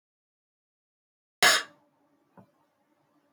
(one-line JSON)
{"cough_length": "3.3 s", "cough_amplitude": 14063, "cough_signal_mean_std_ratio": 0.19, "survey_phase": "beta (2021-08-13 to 2022-03-07)", "age": "45-64", "gender": "Female", "wearing_mask": "No", "symptom_cough_any": true, "symptom_shortness_of_breath": true, "symptom_sore_throat": true, "symptom_diarrhoea": true, "symptom_fatigue": true, "symptom_headache": true, "symptom_onset": "1 day", "smoker_status": "Never smoked", "respiratory_condition_asthma": false, "respiratory_condition_other": true, "recruitment_source": "Test and Trace", "submission_delay": "1 day", "covid_test_result": "Positive", "covid_test_method": "RT-qPCR", "covid_ct_value": 23.6, "covid_ct_gene": "N gene"}